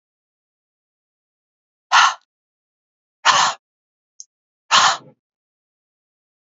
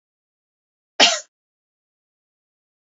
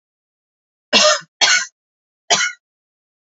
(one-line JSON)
{"exhalation_length": "6.6 s", "exhalation_amplitude": 32643, "exhalation_signal_mean_std_ratio": 0.26, "cough_length": "2.8 s", "cough_amplitude": 29309, "cough_signal_mean_std_ratio": 0.18, "three_cough_length": "3.3 s", "three_cough_amplitude": 32768, "three_cough_signal_mean_std_ratio": 0.36, "survey_phase": "beta (2021-08-13 to 2022-03-07)", "age": "45-64", "gender": "Female", "wearing_mask": "No", "symptom_headache": true, "symptom_onset": "12 days", "smoker_status": "Ex-smoker", "respiratory_condition_asthma": true, "respiratory_condition_other": false, "recruitment_source": "REACT", "submission_delay": "1 day", "covid_test_result": "Negative", "covid_test_method": "RT-qPCR", "influenza_a_test_result": "Negative", "influenza_b_test_result": "Negative"}